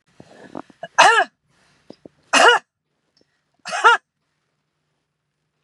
{"three_cough_length": "5.6 s", "three_cough_amplitude": 32650, "three_cough_signal_mean_std_ratio": 0.29, "survey_phase": "beta (2021-08-13 to 2022-03-07)", "age": "45-64", "gender": "Female", "wearing_mask": "No", "symptom_none": true, "smoker_status": "Never smoked", "respiratory_condition_asthma": false, "respiratory_condition_other": false, "recruitment_source": "REACT", "submission_delay": "5 days", "covid_test_result": "Negative", "covid_test_method": "RT-qPCR", "influenza_a_test_result": "Negative", "influenza_b_test_result": "Negative"}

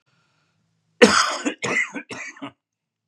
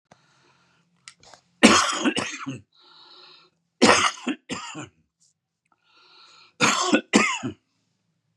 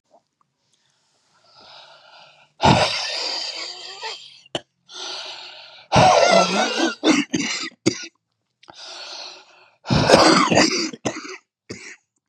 {"cough_length": "3.1 s", "cough_amplitude": 32453, "cough_signal_mean_std_ratio": 0.35, "three_cough_length": "8.4 s", "three_cough_amplitude": 32767, "three_cough_signal_mean_std_ratio": 0.35, "exhalation_length": "12.3 s", "exhalation_amplitude": 32768, "exhalation_signal_mean_std_ratio": 0.46, "survey_phase": "beta (2021-08-13 to 2022-03-07)", "age": "65+", "gender": "Male", "wearing_mask": "No", "symptom_cough_any": true, "symptom_runny_or_blocked_nose": true, "symptom_sore_throat": true, "smoker_status": "Ex-smoker", "respiratory_condition_asthma": false, "respiratory_condition_other": false, "recruitment_source": "Test and Trace", "submission_delay": "2 days", "covid_test_result": "Positive", "covid_test_method": "LFT"}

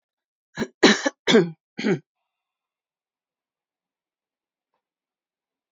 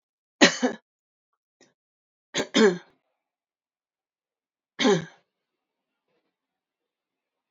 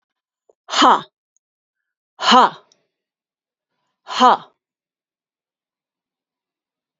{"cough_length": "5.7 s", "cough_amplitude": 29586, "cough_signal_mean_std_ratio": 0.24, "three_cough_length": "7.5 s", "three_cough_amplitude": 25440, "three_cough_signal_mean_std_ratio": 0.23, "exhalation_length": "7.0 s", "exhalation_amplitude": 28545, "exhalation_signal_mean_std_ratio": 0.25, "survey_phase": "beta (2021-08-13 to 2022-03-07)", "age": "65+", "gender": "Female", "wearing_mask": "No", "symptom_none": true, "smoker_status": "Ex-smoker", "respiratory_condition_asthma": false, "respiratory_condition_other": false, "recruitment_source": "REACT", "submission_delay": "2 days", "covid_test_result": "Negative", "covid_test_method": "RT-qPCR", "influenza_a_test_result": "Unknown/Void", "influenza_b_test_result": "Unknown/Void"}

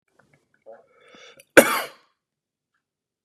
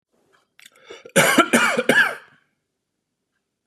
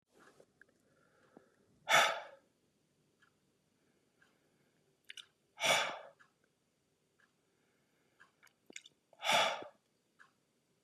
{"cough_length": "3.2 s", "cough_amplitude": 32768, "cough_signal_mean_std_ratio": 0.17, "three_cough_length": "3.7 s", "three_cough_amplitude": 29659, "three_cough_signal_mean_std_ratio": 0.39, "exhalation_length": "10.8 s", "exhalation_amplitude": 5452, "exhalation_signal_mean_std_ratio": 0.25, "survey_phase": "beta (2021-08-13 to 2022-03-07)", "age": "18-44", "gender": "Male", "wearing_mask": "No", "symptom_none": true, "smoker_status": "Never smoked", "respiratory_condition_asthma": false, "respiratory_condition_other": false, "recruitment_source": "REACT", "submission_delay": "4 days", "covid_test_result": "Negative", "covid_test_method": "RT-qPCR"}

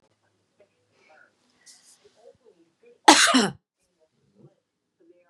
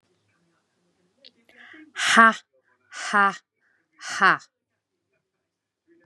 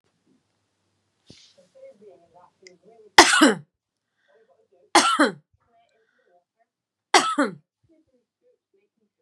{"cough_length": "5.3 s", "cough_amplitude": 32767, "cough_signal_mean_std_ratio": 0.21, "exhalation_length": "6.1 s", "exhalation_amplitude": 27460, "exhalation_signal_mean_std_ratio": 0.27, "three_cough_length": "9.2 s", "three_cough_amplitude": 32768, "three_cough_signal_mean_std_ratio": 0.24, "survey_phase": "beta (2021-08-13 to 2022-03-07)", "age": "45-64", "gender": "Female", "wearing_mask": "No", "symptom_none": true, "smoker_status": "Never smoked", "respiratory_condition_asthma": false, "respiratory_condition_other": false, "recruitment_source": "REACT", "submission_delay": "1 day", "covid_test_result": "Negative", "covid_test_method": "RT-qPCR", "influenza_a_test_result": "Negative", "influenza_b_test_result": "Negative"}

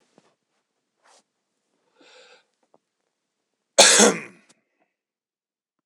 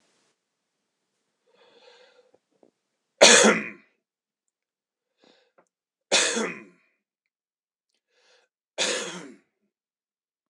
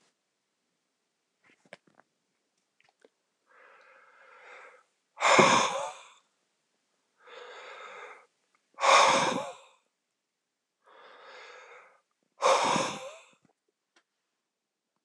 {"cough_length": "5.9 s", "cough_amplitude": 26028, "cough_signal_mean_std_ratio": 0.2, "three_cough_length": "10.5 s", "three_cough_amplitude": 26028, "three_cough_signal_mean_std_ratio": 0.22, "exhalation_length": "15.0 s", "exhalation_amplitude": 17484, "exhalation_signal_mean_std_ratio": 0.29, "survey_phase": "beta (2021-08-13 to 2022-03-07)", "age": "45-64", "gender": "Male", "wearing_mask": "No", "symptom_none": true, "smoker_status": "Never smoked", "respiratory_condition_asthma": false, "respiratory_condition_other": false, "recruitment_source": "REACT", "submission_delay": "2 days", "covid_test_result": "Negative", "covid_test_method": "RT-qPCR", "influenza_a_test_result": "Negative", "influenza_b_test_result": "Negative"}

